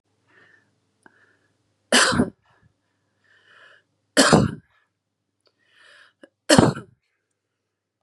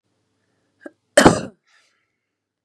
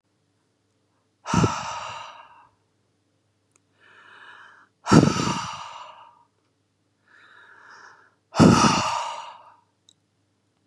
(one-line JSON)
{"three_cough_length": "8.0 s", "three_cough_amplitude": 32767, "three_cough_signal_mean_std_ratio": 0.26, "cough_length": "2.6 s", "cough_amplitude": 32768, "cough_signal_mean_std_ratio": 0.21, "exhalation_length": "10.7 s", "exhalation_amplitude": 30523, "exhalation_signal_mean_std_ratio": 0.3, "survey_phase": "beta (2021-08-13 to 2022-03-07)", "age": "18-44", "gender": "Female", "wearing_mask": "No", "symptom_none": true, "smoker_status": "Ex-smoker", "respiratory_condition_asthma": false, "respiratory_condition_other": false, "recruitment_source": "REACT", "submission_delay": "1 day", "covid_test_result": "Negative", "covid_test_method": "RT-qPCR", "influenza_a_test_result": "Unknown/Void", "influenza_b_test_result": "Unknown/Void"}